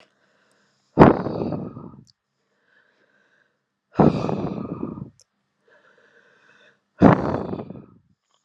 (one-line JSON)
{"exhalation_length": "8.4 s", "exhalation_amplitude": 32768, "exhalation_signal_mean_std_ratio": 0.29, "survey_phase": "beta (2021-08-13 to 2022-03-07)", "age": "18-44", "gender": "Male", "wearing_mask": "No", "symptom_none": true, "symptom_onset": "13 days", "smoker_status": "Current smoker (e-cigarettes or vapes only)", "respiratory_condition_asthma": false, "respiratory_condition_other": false, "recruitment_source": "REACT", "submission_delay": "1 day", "covid_test_result": "Negative", "covid_test_method": "RT-qPCR", "influenza_a_test_result": "Negative", "influenza_b_test_result": "Negative"}